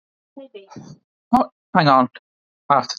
{"exhalation_length": "3.0 s", "exhalation_amplitude": 28067, "exhalation_signal_mean_std_ratio": 0.36, "survey_phase": "beta (2021-08-13 to 2022-03-07)", "age": "18-44", "gender": "Male", "wearing_mask": "No", "symptom_fever_high_temperature": true, "symptom_headache": true, "symptom_onset": "3 days", "smoker_status": "Never smoked", "respiratory_condition_asthma": true, "respiratory_condition_other": false, "recruitment_source": "REACT", "submission_delay": "1 day", "covid_test_result": "Negative", "covid_test_method": "RT-qPCR"}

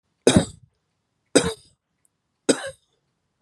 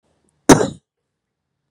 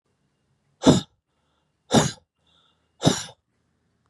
{"three_cough_length": "3.4 s", "three_cough_amplitude": 31631, "three_cough_signal_mean_std_ratio": 0.25, "cough_length": "1.7 s", "cough_amplitude": 32768, "cough_signal_mean_std_ratio": 0.22, "exhalation_length": "4.1 s", "exhalation_amplitude": 25808, "exhalation_signal_mean_std_ratio": 0.26, "survey_phase": "beta (2021-08-13 to 2022-03-07)", "age": "45-64", "gender": "Male", "wearing_mask": "No", "symptom_none": true, "smoker_status": "Ex-smoker", "respiratory_condition_asthma": false, "respiratory_condition_other": false, "recruitment_source": "REACT", "submission_delay": "6 days", "covid_test_result": "Negative", "covid_test_method": "RT-qPCR", "influenza_a_test_result": "Negative", "influenza_b_test_result": "Negative"}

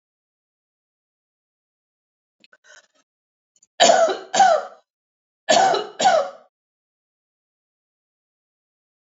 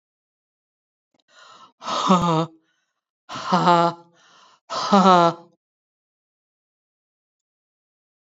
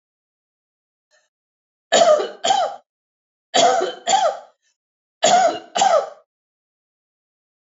{"cough_length": "9.1 s", "cough_amplitude": 27768, "cough_signal_mean_std_ratio": 0.3, "exhalation_length": "8.3 s", "exhalation_amplitude": 29943, "exhalation_signal_mean_std_ratio": 0.32, "three_cough_length": "7.7 s", "three_cough_amplitude": 24389, "three_cough_signal_mean_std_ratio": 0.42, "survey_phase": "beta (2021-08-13 to 2022-03-07)", "age": "45-64", "gender": "Female", "wearing_mask": "No", "symptom_runny_or_blocked_nose": true, "smoker_status": "Never smoked", "respiratory_condition_asthma": false, "respiratory_condition_other": false, "recruitment_source": "REACT", "submission_delay": "1 day", "covid_test_result": "Negative", "covid_test_method": "RT-qPCR"}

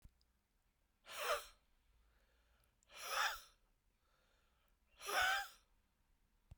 {"exhalation_length": "6.6 s", "exhalation_amplitude": 1994, "exhalation_signal_mean_std_ratio": 0.34, "survey_phase": "beta (2021-08-13 to 2022-03-07)", "age": "45-64", "gender": "Male", "wearing_mask": "No", "symptom_cough_any": true, "symptom_shortness_of_breath": true, "symptom_sore_throat": true, "symptom_fatigue": true, "symptom_headache": true, "symptom_change_to_sense_of_smell_or_taste": true, "symptom_loss_of_taste": true, "symptom_onset": "33 days", "smoker_status": "Ex-smoker", "respiratory_condition_asthma": false, "respiratory_condition_other": false, "recruitment_source": "Test and Trace", "submission_delay": "2 days", "covid_test_result": "Positive", "covid_test_method": "RT-qPCR", "covid_ct_value": 25.4, "covid_ct_gene": "ORF1ab gene"}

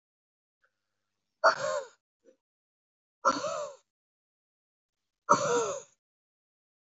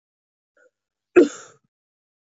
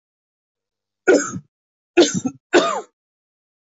{"exhalation_length": "6.8 s", "exhalation_amplitude": 14068, "exhalation_signal_mean_std_ratio": 0.3, "cough_length": "2.3 s", "cough_amplitude": 23753, "cough_signal_mean_std_ratio": 0.18, "three_cough_length": "3.7 s", "three_cough_amplitude": 24497, "three_cough_signal_mean_std_ratio": 0.33, "survey_phase": "beta (2021-08-13 to 2022-03-07)", "age": "45-64", "gender": "Male", "wearing_mask": "No", "symptom_cough_any": true, "symptom_runny_or_blocked_nose": true, "symptom_fatigue": true, "symptom_headache": true, "smoker_status": "Ex-smoker", "respiratory_condition_asthma": false, "respiratory_condition_other": false, "recruitment_source": "Test and Trace", "submission_delay": "1 day", "covid_test_result": "Positive", "covid_test_method": "LFT"}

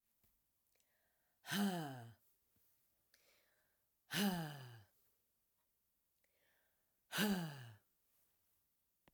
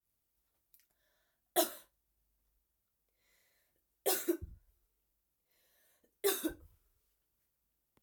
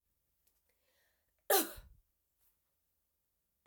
{"exhalation_length": "9.1 s", "exhalation_amplitude": 1687, "exhalation_signal_mean_std_ratio": 0.34, "three_cough_length": "8.0 s", "three_cough_amplitude": 5562, "three_cough_signal_mean_std_ratio": 0.23, "cough_length": "3.7 s", "cough_amplitude": 5115, "cough_signal_mean_std_ratio": 0.18, "survey_phase": "beta (2021-08-13 to 2022-03-07)", "age": "45-64", "gender": "Female", "wearing_mask": "No", "symptom_cough_any": true, "symptom_runny_or_blocked_nose": true, "symptom_change_to_sense_of_smell_or_taste": true, "symptom_other": true, "symptom_onset": "3 days", "smoker_status": "Ex-smoker", "respiratory_condition_asthma": false, "respiratory_condition_other": false, "recruitment_source": "Test and Trace", "submission_delay": "2 days", "covid_test_result": "Positive", "covid_test_method": "RT-qPCR"}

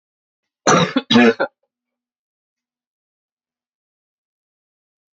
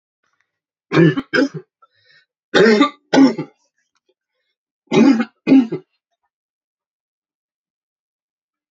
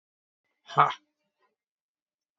{"cough_length": "5.1 s", "cough_amplitude": 27852, "cough_signal_mean_std_ratio": 0.26, "three_cough_length": "8.7 s", "three_cough_amplitude": 31791, "three_cough_signal_mean_std_ratio": 0.34, "exhalation_length": "2.4 s", "exhalation_amplitude": 18636, "exhalation_signal_mean_std_ratio": 0.18, "survey_phase": "beta (2021-08-13 to 2022-03-07)", "age": "18-44", "gender": "Male", "wearing_mask": "No", "symptom_cough_any": true, "symptom_runny_or_blocked_nose": true, "symptom_fatigue": true, "symptom_fever_high_temperature": true, "symptom_headache": true, "symptom_change_to_sense_of_smell_or_taste": true, "symptom_loss_of_taste": true, "symptom_onset": "5 days", "smoker_status": "Never smoked", "respiratory_condition_asthma": false, "respiratory_condition_other": false, "recruitment_source": "Test and Trace", "submission_delay": "1 day", "covid_test_result": "Positive", "covid_test_method": "RT-qPCR", "covid_ct_value": 21.8, "covid_ct_gene": "N gene"}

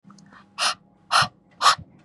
{"exhalation_length": "2.0 s", "exhalation_amplitude": 23279, "exhalation_signal_mean_std_ratio": 0.38, "survey_phase": "beta (2021-08-13 to 2022-03-07)", "age": "18-44", "gender": "Female", "wearing_mask": "No", "symptom_cough_any": true, "symptom_runny_or_blocked_nose": true, "symptom_sore_throat": true, "symptom_onset": "6 days", "smoker_status": "Never smoked", "respiratory_condition_asthma": false, "respiratory_condition_other": false, "recruitment_source": "Test and Trace", "submission_delay": "2 days", "covid_test_result": "Negative", "covid_test_method": "ePCR"}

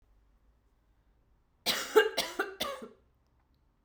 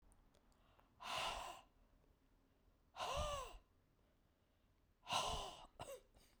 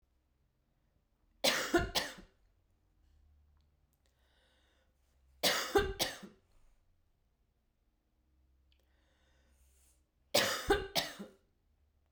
{"cough_length": "3.8 s", "cough_amplitude": 12133, "cough_signal_mean_std_ratio": 0.31, "exhalation_length": "6.4 s", "exhalation_amplitude": 1392, "exhalation_signal_mean_std_ratio": 0.46, "three_cough_length": "12.1 s", "three_cough_amplitude": 7967, "three_cough_signal_mean_std_ratio": 0.3, "survey_phase": "beta (2021-08-13 to 2022-03-07)", "age": "45-64", "gender": "Female", "wearing_mask": "No", "symptom_cough_any": true, "symptom_runny_or_blocked_nose": true, "symptom_sore_throat": true, "symptom_headache": true, "symptom_onset": "4 days", "smoker_status": "Never smoked", "respiratory_condition_asthma": false, "respiratory_condition_other": false, "recruitment_source": "Test and Trace", "submission_delay": "3 days", "covid_test_result": "Positive", "covid_test_method": "RT-qPCR", "covid_ct_value": 24.9, "covid_ct_gene": "ORF1ab gene"}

